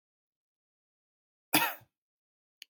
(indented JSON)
{
  "cough_length": "2.7 s",
  "cough_amplitude": 12154,
  "cough_signal_mean_std_ratio": 0.19,
  "survey_phase": "beta (2021-08-13 to 2022-03-07)",
  "age": "18-44",
  "gender": "Male",
  "wearing_mask": "No",
  "symptom_none": true,
  "smoker_status": "Never smoked",
  "respiratory_condition_asthma": false,
  "respiratory_condition_other": false,
  "recruitment_source": "REACT",
  "submission_delay": "1 day",
  "covid_test_result": "Negative",
  "covid_test_method": "RT-qPCR",
  "influenza_a_test_result": "Negative",
  "influenza_b_test_result": "Negative"
}